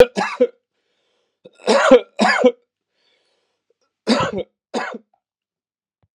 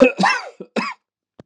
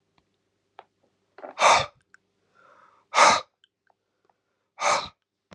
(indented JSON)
{
  "three_cough_length": "6.1 s",
  "three_cough_amplitude": 32768,
  "three_cough_signal_mean_std_ratio": 0.34,
  "cough_length": "1.5 s",
  "cough_amplitude": 32767,
  "cough_signal_mean_std_ratio": 0.43,
  "exhalation_length": "5.5 s",
  "exhalation_amplitude": 24032,
  "exhalation_signal_mean_std_ratio": 0.28,
  "survey_phase": "beta (2021-08-13 to 2022-03-07)",
  "age": "45-64",
  "gender": "Male",
  "wearing_mask": "No",
  "symptom_cough_any": true,
  "symptom_runny_or_blocked_nose": true,
  "smoker_status": "Never smoked",
  "respiratory_condition_asthma": false,
  "respiratory_condition_other": false,
  "recruitment_source": "Test and Trace",
  "submission_delay": "2 days",
  "covid_test_result": "Positive",
  "covid_test_method": "RT-qPCR",
  "covid_ct_value": 38.2,
  "covid_ct_gene": "ORF1ab gene"
}